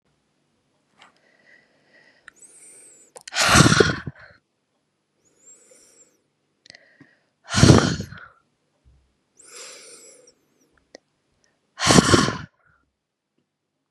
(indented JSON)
{
  "exhalation_length": "13.9 s",
  "exhalation_amplitude": 32768,
  "exhalation_signal_mean_std_ratio": 0.26,
  "survey_phase": "beta (2021-08-13 to 2022-03-07)",
  "age": "18-44",
  "gender": "Female",
  "wearing_mask": "No",
  "symptom_none": true,
  "smoker_status": "Never smoked",
  "respiratory_condition_asthma": false,
  "respiratory_condition_other": false,
  "recruitment_source": "REACT",
  "submission_delay": "1 day",
  "covid_test_result": "Negative",
  "covid_test_method": "RT-qPCR"
}